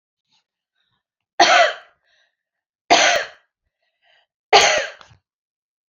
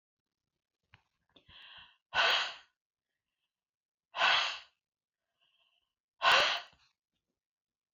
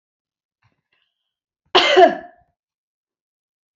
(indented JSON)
{
  "three_cough_length": "5.9 s",
  "three_cough_amplitude": 28913,
  "three_cough_signal_mean_std_ratio": 0.32,
  "exhalation_length": "7.9 s",
  "exhalation_amplitude": 7917,
  "exhalation_signal_mean_std_ratio": 0.3,
  "cough_length": "3.8 s",
  "cough_amplitude": 28859,
  "cough_signal_mean_std_ratio": 0.25,
  "survey_phase": "beta (2021-08-13 to 2022-03-07)",
  "age": "65+",
  "gender": "Female",
  "wearing_mask": "No",
  "symptom_none": true,
  "smoker_status": "Never smoked",
  "respiratory_condition_asthma": false,
  "respiratory_condition_other": false,
  "recruitment_source": "REACT",
  "submission_delay": "2 days",
  "covid_test_result": "Negative",
  "covid_test_method": "RT-qPCR",
  "influenza_a_test_result": "Negative",
  "influenza_b_test_result": "Negative"
}